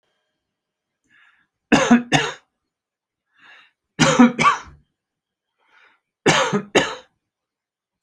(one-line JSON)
{"three_cough_length": "8.0 s", "three_cough_amplitude": 30740, "three_cough_signal_mean_std_ratio": 0.33, "survey_phase": "beta (2021-08-13 to 2022-03-07)", "age": "65+", "gender": "Male", "wearing_mask": "No", "symptom_none": true, "smoker_status": "Never smoked", "respiratory_condition_asthma": false, "respiratory_condition_other": false, "recruitment_source": "REACT", "submission_delay": "1 day", "covid_test_result": "Negative", "covid_test_method": "RT-qPCR"}